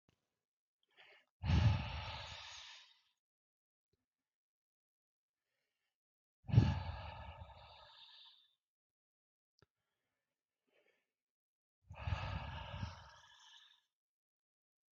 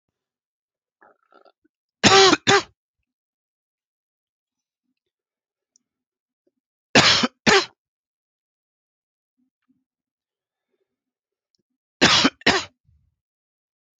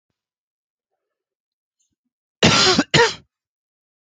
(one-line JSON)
{"exhalation_length": "14.9 s", "exhalation_amplitude": 5174, "exhalation_signal_mean_std_ratio": 0.27, "three_cough_length": "14.0 s", "three_cough_amplitude": 29731, "three_cough_signal_mean_std_ratio": 0.24, "cough_length": "4.1 s", "cough_amplitude": 32767, "cough_signal_mean_std_ratio": 0.3, "survey_phase": "beta (2021-08-13 to 2022-03-07)", "age": "45-64", "gender": "Male", "wearing_mask": "No", "symptom_cough_any": true, "symptom_runny_or_blocked_nose": true, "symptom_sore_throat": true, "symptom_fatigue": true, "symptom_headache": true, "symptom_change_to_sense_of_smell_or_taste": true, "symptom_onset": "3 days", "smoker_status": "Ex-smoker", "respiratory_condition_asthma": false, "respiratory_condition_other": false, "recruitment_source": "Test and Trace", "submission_delay": "2 days", "covid_test_result": "Positive", "covid_test_method": "RT-qPCR", "covid_ct_value": 18.0, "covid_ct_gene": "ORF1ab gene", "covid_ct_mean": 18.4, "covid_viral_load": "900000 copies/ml", "covid_viral_load_category": "Low viral load (10K-1M copies/ml)"}